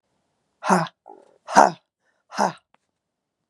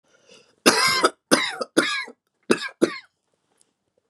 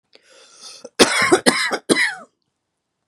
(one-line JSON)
{"exhalation_length": "3.5 s", "exhalation_amplitude": 32767, "exhalation_signal_mean_std_ratio": 0.26, "three_cough_length": "4.1 s", "three_cough_amplitude": 30376, "three_cough_signal_mean_std_ratio": 0.39, "cough_length": "3.1 s", "cough_amplitude": 32768, "cough_signal_mean_std_ratio": 0.42, "survey_phase": "beta (2021-08-13 to 2022-03-07)", "age": "18-44", "gender": "Female", "wearing_mask": "No", "symptom_none": true, "smoker_status": "Never smoked", "respiratory_condition_asthma": false, "respiratory_condition_other": false, "recruitment_source": "REACT", "submission_delay": "2 days", "covid_test_result": "Negative", "covid_test_method": "RT-qPCR", "influenza_a_test_result": "Negative", "influenza_b_test_result": "Negative"}